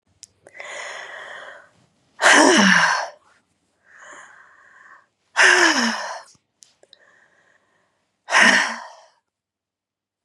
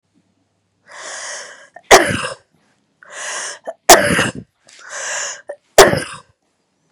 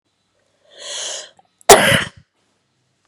{"exhalation_length": "10.2 s", "exhalation_amplitude": 32485, "exhalation_signal_mean_std_ratio": 0.37, "three_cough_length": "6.9 s", "three_cough_amplitude": 32768, "three_cough_signal_mean_std_ratio": 0.33, "cough_length": "3.1 s", "cough_amplitude": 32768, "cough_signal_mean_std_ratio": 0.28, "survey_phase": "beta (2021-08-13 to 2022-03-07)", "age": "45-64", "gender": "Female", "wearing_mask": "No", "symptom_none": true, "smoker_status": "Never smoked", "respiratory_condition_asthma": false, "respiratory_condition_other": false, "recruitment_source": "REACT", "submission_delay": "1 day", "covid_test_result": "Negative", "covid_test_method": "RT-qPCR", "influenza_a_test_result": "Negative", "influenza_b_test_result": "Negative"}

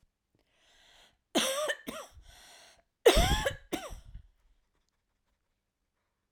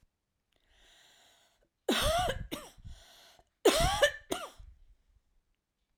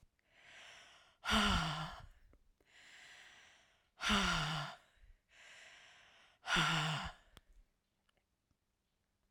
{"cough_length": "6.3 s", "cough_amplitude": 12099, "cough_signal_mean_std_ratio": 0.3, "three_cough_length": "6.0 s", "three_cough_amplitude": 8961, "three_cough_signal_mean_std_ratio": 0.36, "exhalation_length": "9.3 s", "exhalation_amplitude": 3454, "exhalation_signal_mean_std_ratio": 0.41, "survey_phase": "alpha (2021-03-01 to 2021-08-12)", "age": "45-64", "gender": "Female", "wearing_mask": "No", "symptom_none": true, "smoker_status": "Ex-smoker", "respiratory_condition_asthma": false, "respiratory_condition_other": false, "recruitment_source": "REACT", "submission_delay": "3 days", "covid_test_result": "Negative", "covid_test_method": "RT-qPCR"}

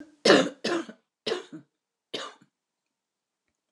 {"cough_length": "3.7 s", "cough_amplitude": 23367, "cough_signal_mean_std_ratio": 0.29, "survey_phase": "alpha (2021-03-01 to 2021-08-12)", "age": "65+", "gender": "Female", "wearing_mask": "No", "symptom_change_to_sense_of_smell_or_taste": true, "smoker_status": "Never smoked", "respiratory_condition_asthma": false, "respiratory_condition_other": false, "recruitment_source": "REACT", "submission_delay": "2 days", "covid_test_result": "Negative", "covid_test_method": "RT-qPCR"}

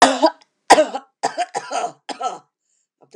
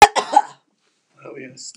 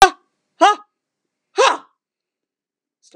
{"three_cough_length": "3.2 s", "three_cough_amplitude": 32768, "three_cough_signal_mean_std_ratio": 0.38, "cough_length": "1.8 s", "cough_amplitude": 32768, "cough_signal_mean_std_ratio": 0.27, "exhalation_length": "3.2 s", "exhalation_amplitude": 32768, "exhalation_signal_mean_std_ratio": 0.26, "survey_phase": "beta (2021-08-13 to 2022-03-07)", "age": "65+", "gender": "Female", "wearing_mask": "No", "symptom_none": true, "symptom_onset": "12 days", "smoker_status": "Never smoked", "respiratory_condition_asthma": false, "respiratory_condition_other": true, "recruitment_source": "REACT", "submission_delay": "8 days", "covid_test_result": "Negative", "covid_test_method": "RT-qPCR", "influenza_a_test_result": "Negative", "influenza_b_test_result": "Negative"}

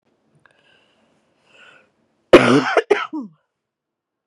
{"cough_length": "4.3 s", "cough_amplitude": 32768, "cough_signal_mean_std_ratio": 0.27, "survey_phase": "beta (2021-08-13 to 2022-03-07)", "age": "18-44", "gender": "Female", "wearing_mask": "No", "symptom_cough_any": true, "symptom_runny_or_blocked_nose": true, "symptom_shortness_of_breath": true, "symptom_fatigue": true, "symptom_headache": true, "symptom_change_to_sense_of_smell_or_taste": true, "symptom_loss_of_taste": true, "symptom_onset": "3 days", "smoker_status": "Never smoked", "respiratory_condition_asthma": true, "respiratory_condition_other": false, "recruitment_source": "Test and Trace", "submission_delay": "2 days", "covid_test_result": "Positive", "covid_test_method": "RT-qPCR", "covid_ct_value": 21.2, "covid_ct_gene": "ORF1ab gene", "covid_ct_mean": 22.0, "covid_viral_load": "60000 copies/ml", "covid_viral_load_category": "Low viral load (10K-1M copies/ml)"}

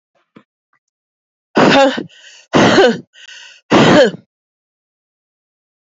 {"exhalation_length": "5.8 s", "exhalation_amplitude": 30224, "exhalation_signal_mean_std_ratio": 0.41, "survey_phase": "alpha (2021-03-01 to 2021-08-12)", "age": "45-64", "gender": "Female", "wearing_mask": "No", "symptom_new_continuous_cough": true, "symptom_shortness_of_breath": true, "symptom_fatigue": true, "symptom_fever_high_temperature": true, "symptom_headache": true, "symptom_onset": "3 days", "smoker_status": "Ex-smoker", "respiratory_condition_asthma": false, "respiratory_condition_other": false, "recruitment_source": "Test and Trace", "submission_delay": "2 days", "covid_test_result": "Positive", "covid_test_method": "RT-qPCR"}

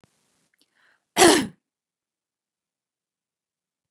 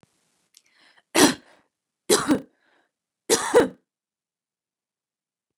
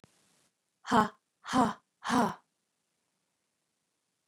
{"cough_length": "3.9 s", "cough_amplitude": 29050, "cough_signal_mean_std_ratio": 0.2, "three_cough_length": "5.6 s", "three_cough_amplitude": 28082, "three_cough_signal_mean_std_ratio": 0.27, "exhalation_length": "4.3 s", "exhalation_amplitude": 11216, "exhalation_signal_mean_std_ratio": 0.28, "survey_phase": "beta (2021-08-13 to 2022-03-07)", "age": "45-64", "gender": "Female", "wearing_mask": "No", "symptom_none": true, "symptom_onset": "6 days", "smoker_status": "Never smoked", "respiratory_condition_asthma": false, "respiratory_condition_other": false, "recruitment_source": "REACT", "submission_delay": "1 day", "covid_test_result": "Negative", "covid_test_method": "RT-qPCR", "influenza_a_test_result": "Unknown/Void", "influenza_b_test_result": "Unknown/Void"}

